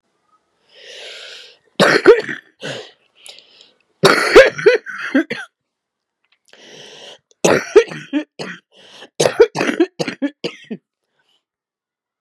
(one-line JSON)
{"three_cough_length": "12.2 s", "three_cough_amplitude": 32768, "three_cough_signal_mean_std_ratio": 0.34, "survey_phase": "beta (2021-08-13 to 2022-03-07)", "age": "45-64", "gender": "Female", "wearing_mask": "Yes", "symptom_cough_any": true, "symptom_runny_or_blocked_nose": true, "symptom_diarrhoea": true, "symptom_fatigue": true, "symptom_headache": true, "symptom_change_to_sense_of_smell_or_taste": true, "smoker_status": "Never smoked", "respiratory_condition_asthma": false, "respiratory_condition_other": false, "recruitment_source": "Test and Trace", "submission_delay": "1 day", "covid_test_result": "Positive", "covid_test_method": "RT-qPCR", "covid_ct_value": 26.2, "covid_ct_gene": "ORF1ab gene", "covid_ct_mean": 26.8, "covid_viral_load": "1600 copies/ml", "covid_viral_load_category": "Minimal viral load (< 10K copies/ml)"}